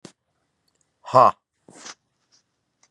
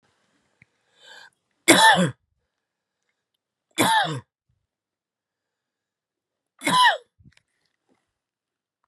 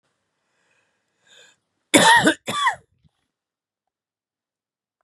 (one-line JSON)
{"exhalation_length": "2.9 s", "exhalation_amplitude": 28925, "exhalation_signal_mean_std_ratio": 0.19, "three_cough_length": "8.9 s", "three_cough_amplitude": 32768, "three_cough_signal_mean_std_ratio": 0.27, "cough_length": "5.0 s", "cough_amplitude": 32764, "cough_signal_mean_std_ratio": 0.27, "survey_phase": "beta (2021-08-13 to 2022-03-07)", "age": "65+", "gender": "Male", "wearing_mask": "No", "symptom_cough_any": true, "symptom_runny_or_blocked_nose": true, "symptom_sore_throat": true, "symptom_headache": true, "smoker_status": "Ex-smoker", "respiratory_condition_asthma": false, "respiratory_condition_other": false, "recruitment_source": "Test and Trace", "submission_delay": "1 day", "covid_test_result": "Positive", "covid_test_method": "RT-qPCR", "covid_ct_value": 26.9, "covid_ct_gene": "ORF1ab gene"}